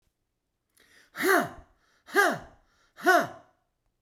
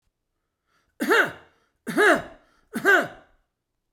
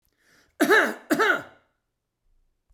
{"exhalation_length": "4.0 s", "exhalation_amplitude": 11429, "exhalation_signal_mean_std_ratio": 0.35, "three_cough_length": "3.9 s", "three_cough_amplitude": 18584, "three_cough_signal_mean_std_ratio": 0.38, "cough_length": "2.7 s", "cough_amplitude": 15347, "cough_signal_mean_std_ratio": 0.38, "survey_phase": "beta (2021-08-13 to 2022-03-07)", "age": "65+", "gender": "Male", "wearing_mask": "No", "symptom_none": true, "smoker_status": "Never smoked", "respiratory_condition_asthma": false, "respiratory_condition_other": false, "recruitment_source": "REACT", "submission_delay": "3 days", "covid_test_result": "Negative", "covid_test_method": "RT-qPCR"}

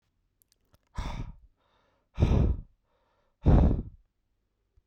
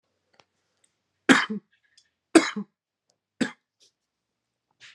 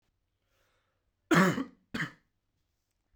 {"exhalation_length": "4.9 s", "exhalation_amplitude": 11707, "exhalation_signal_mean_std_ratio": 0.35, "three_cough_length": "4.9 s", "three_cough_amplitude": 30147, "three_cough_signal_mean_std_ratio": 0.2, "cough_length": "3.2 s", "cough_amplitude": 10101, "cough_signal_mean_std_ratio": 0.27, "survey_phase": "beta (2021-08-13 to 2022-03-07)", "age": "18-44", "gender": "Male", "wearing_mask": "No", "symptom_none": true, "smoker_status": "Never smoked", "respiratory_condition_asthma": false, "respiratory_condition_other": false, "recruitment_source": "Test and Trace", "submission_delay": "0 days", "covid_test_result": "Negative", "covid_test_method": "LFT"}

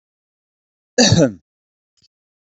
{"cough_length": "2.6 s", "cough_amplitude": 31626, "cough_signal_mean_std_ratio": 0.28, "survey_phase": "beta (2021-08-13 to 2022-03-07)", "age": "45-64", "gender": "Male", "wearing_mask": "No", "symptom_none": true, "smoker_status": "Never smoked", "respiratory_condition_asthma": false, "respiratory_condition_other": false, "recruitment_source": "Test and Trace", "submission_delay": "2 days", "covid_test_result": "Positive", "covid_test_method": "RT-qPCR", "covid_ct_value": 20.9, "covid_ct_gene": "N gene", "covid_ct_mean": 21.7, "covid_viral_load": "77000 copies/ml", "covid_viral_load_category": "Low viral load (10K-1M copies/ml)"}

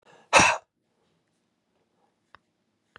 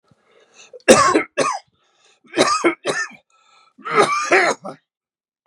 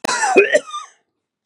{"exhalation_length": "3.0 s", "exhalation_amplitude": 21322, "exhalation_signal_mean_std_ratio": 0.22, "three_cough_length": "5.5 s", "three_cough_amplitude": 32768, "three_cough_signal_mean_std_ratio": 0.44, "cough_length": "1.5 s", "cough_amplitude": 32768, "cough_signal_mean_std_ratio": 0.5, "survey_phase": "beta (2021-08-13 to 2022-03-07)", "age": "45-64", "gender": "Female", "wearing_mask": "No", "symptom_shortness_of_breath": true, "symptom_sore_throat": true, "symptom_onset": "4 days", "smoker_status": "Ex-smoker", "respiratory_condition_asthma": true, "respiratory_condition_other": true, "recruitment_source": "Test and Trace", "submission_delay": "2 days", "covid_test_result": "Positive", "covid_test_method": "RT-qPCR", "covid_ct_value": 30.8, "covid_ct_gene": "ORF1ab gene", "covid_ct_mean": 31.1, "covid_viral_load": "65 copies/ml", "covid_viral_load_category": "Minimal viral load (< 10K copies/ml)"}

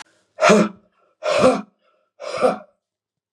{"exhalation_length": "3.3 s", "exhalation_amplitude": 32738, "exhalation_signal_mean_std_ratio": 0.41, "survey_phase": "beta (2021-08-13 to 2022-03-07)", "age": "45-64", "gender": "Male", "wearing_mask": "No", "symptom_cough_any": true, "smoker_status": "Never smoked", "respiratory_condition_asthma": false, "respiratory_condition_other": false, "recruitment_source": "Test and Trace", "submission_delay": "2 days", "covid_test_result": "Positive", "covid_test_method": "RT-qPCR", "covid_ct_value": 19.2, "covid_ct_gene": "ORF1ab gene"}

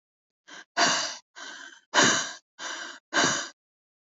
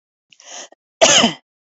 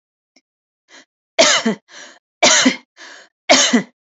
{"exhalation_length": "4.0 s", "exhalation_amplitude": 15143, "exhalation_signal_mean_std_ratio": 0.45, "cough_length": "1.7 s", "cough_amplitude": 31072, "cough_signal_mean_std_ratio": 0.36, "three_cough_length": "4.1 s", "three_cough_amplitude": 29580, "three_cough_signal_mean_std_ratio": 0.41, "survey_phase": "alpha (2021-03-01 to 2021-08-12)", "age": "18-44", "gender": "Female", "wearing_mask": "No", "symptom_cough_any": true, "symptom_onset": "7 days", "smoker_status": "Never smoked", "respiratory_condition_asthma": false, "respiratory_condition_other": false, "recruitment_source": "REACT", "submission_delay": "3 days", "covid_test_result": "Negative", "covid_test_method": "RT-qPCR"}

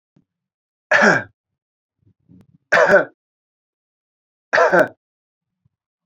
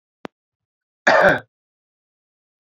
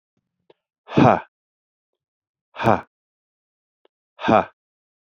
{"three_cough_length": "6.1 s", "three_cough_amplitude": 27038, "three_cough_signal_mean_std_ratio": 0.32, "cough_length": "2.6 s", "cough_amplitude": 27487, "cough_signal_mean_std_ratio": 0.28, "exhalation_length": "5.1 s", "exhalation_amplitude": 28024, "exhalation_signal_mean_std_ratio": 0.24, "survey_phase": "beta (2021-08-13 to 2022-03-07)", "age": "45-64", "gender": "Male", "wearing_mask": "No", "symptom_none": true, "smoker_status": "Never smoked", "respiratory_condition_asthma": false, "respiratory_condition_other": false, "recruitment_source": "REACT", "submission_delay": "0 days", "covid_test_result": "Negative", "covid_test_method": "RT-qPCR", "influenza_a_test_result": "Negative", "influenza_b_test_result": "Negative"}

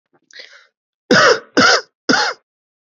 {"three_cough_length": "3.0 s", "three_cough_amplitude": 32768, "three_cough_signal_mean_std_ratio": 0.42, "survey_phase": "beta (2021-08-13 to 2022-03-07)", "age": "18-44", "gender": "Male", "wearing_mask": "No", "symptom_cough_any": true, "symptom_fever_high_temperature": true, "symptom_onset": "11 days", "smoker_status": "Current smoker (1 to 10 cigarettes per day)", "respiratory_condition_asthma": false, "respiratory_condition_other": false, "recruitment_source": "Test and Trace", "submission_delay": "2 days", "covid_test_result": "Positive", "covid_test_method": "RT-qPCR", "covid_ct_value": 23.5, "covid_ct_gene": "N gene"}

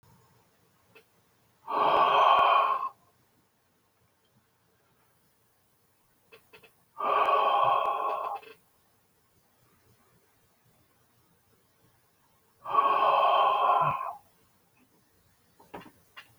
{"exhalation_length": "16.4 s", "exhalation_amplitude": 11083, "exhalation_signal_mean_std_ratio": 0.42, "survey_phase": "beta (2021-08-13 to 2022-03-07)", "age": "65+", "gender": "Male", "wearing_mask": "No", "symptom_none": true, "smoker_status": "Ex-smoker", "respiratory_condition_asthma": false, "respiratory_condition_other": false, "recruitment_source": "REACT", "submission_delay": "3 days", "covid_test_result": "Negative", "covid_test_method": "RT-qPCR", "influenza_a_test_result": "Negative", "influenza_b_test_result": "Negative"}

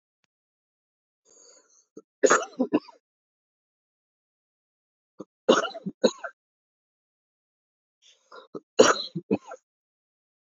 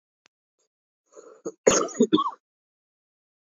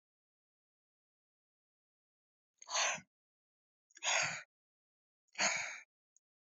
{"three_cough_length": "10.4 s", "three_cough_amplitude": 25258, "three_cough_signal_mean_std_ratio": 0.22, "cough_length": "3.4 s", "cough_amplitude": 26650, "cough_signal_mean_std_ratio": 0.28, "exhalation_length": "6.6 s", "exhalation_amplitude": 3031, "exhalation_signal_mean_std_ratio": 0.3, "survey_phase": "beta (2021-08-13 to 2022-03-07)", "age": "18-44", "gender": "Male", "wearing_mask": "No", "symptom_new_continuous_cough": true, "symptom_runny_or_blocked_nose": true, "symptom_fever_high_temperature": true, "symptom_headache": true, "symptom_change_to_sense_of_smell_or_taste": true, "symptom_loss_of_taste": true, "symptom_onset": "5 days", "smoker_status": "Never smoked", "respiratory_condition_asthma": false, "respiratory_condition_other": false, "recruitment_source": "Test and Trace", "submission_delay": "2 days", "covid_test_result": "Positive", "covid_test_method": "RT-qPCR", "covid_ct_value": 17.3, "covid_ct_gene": "ORF1ab gene", "covid_ct_mean": 17.6, "covid_viral_load": "1600000 copies/ml", "covid_viral_load_category": "High viral load (>1M copies/ml)"}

